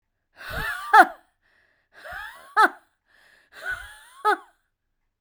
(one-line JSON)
{"exhalation_length": "5.2 s", "exhalation_amplitude": 32767, "exhalation_signal_mean_std_ratio": 0.27, "survey_phase": "beta (2021-08-13 to 2022-03-07)", "age": "45-64", "gender": "Female", "wearing_mask": "No", "symptom_cough_any": true, "symptom_runny_or_blocked_nose": true, "symptom_fatigue": true, "symptom_fever_high_temperature": true, "symptom_headache": true, "symptom_onset": "2 days", "smoker_status": "Ex-smoker", "respiratory_condition_asthma": false, "respiratory_condition_other": false, "recruitment_source": "Test and Trace", "submission_delay": "2 days", "covid_test_result": "Positive", "covid_test_method": "RT-qPCR"}